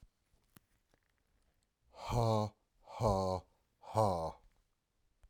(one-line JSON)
{"exhalation_length": "5.3 s", "exhalation_amplitude": 4458, "exhalation_signal_mean_std_ratio": 0.42, "survey_phase": "alpha (2021-03-01 to 2021-08-12)", "age": "45-64", "gender": "Male", "wearing_mask": "No", "symptom_none": true, "smoker_status": "Ex-smoker", "respiratory_condition_asthma": false, "respiratory_condition_other": false, "recruitment_source": "REACT", "submission_delay": "1 day", "covid_test_result": "Negative", "covid_test_method": "RT-qPCR"}